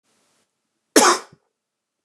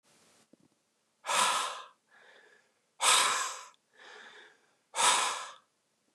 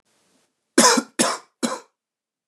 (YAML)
cough_length: 2.0 s
cough_amplitude: 29204
cough_signal_mean_std_ratio: 0.26
exhalation_length: 6.1 s
exhalation_amplitude: 9646
exhalation_signal_mean_std_ratio: 0.41
three_cough_length: 2.5 s
three_cough_amplitude: 28675
three_cough_signal_mean_std_ratio: 0.34
survey_phase: beta (2021-08-13 to 2022-03-07)
age: 18-44
gender: Male
wearing_mask: 'No'
symptom_cough_any: true
symptom_runny_or_blocked_nose: true
symptom_sore_throat: true
symptom_fatigue: true
symptom_headache: true
smoker_status: Never smoked
respiratory_condition_asthma: false
respiratory_condition_other: false
recruitment_source: Test and Trace
submission_delay: 1 day
covid_test_result: Positive
covid_test_method: RT-qPCR
covid_ct_value: 22.5
covid_ct_gene: N gene